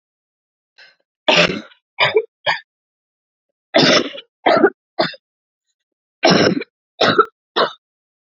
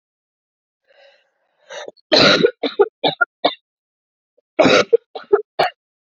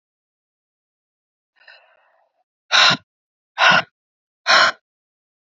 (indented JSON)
{
  "three_cough_length": "8.4 s",
  "three_cough_amplitude": 32768,
  "three_cough_signal_mean_std_ratio": 0.39,
  "cough_length": "6.1 s",
  "cough_amplitude": 32414,
  "cough_signal_mean_std_ratio": 0.35,
  "exhalation_length": "5.5 s",
  "exhalation_amplitude": 30659,
  "exhalation_signal_mean_std_ratio": 0.29,
  "survey_phase": "beta (2021-08-13 to 2022-03-07)",
  "age": "18-44",
  "gender": "Female",
  "wearing_mask": "No",
  "symptom_cough_any": true,
  "symptom_new_continuous_cough": true,
  "symptom_runny_or_blocked_nose": true,
  "symptom_shortness_of_breath": true,
  "symptom_diarrhoea": true,
  "symptom_fatigue": true,
  "symptom_headache": true,
  "symptom_onset": "3 days",
  "smoker_status": "Current smoker (1 to 10 cigarettes per day)",
  "respiratory_condition_asthma": false,
  "respiratory_condition_other": false,
  "recruitment_source": "Test and Trace",
  "submission_delay": "1 day",
  "covid_test_result": "Positive",
  "covid_test_method": "ePCR"
}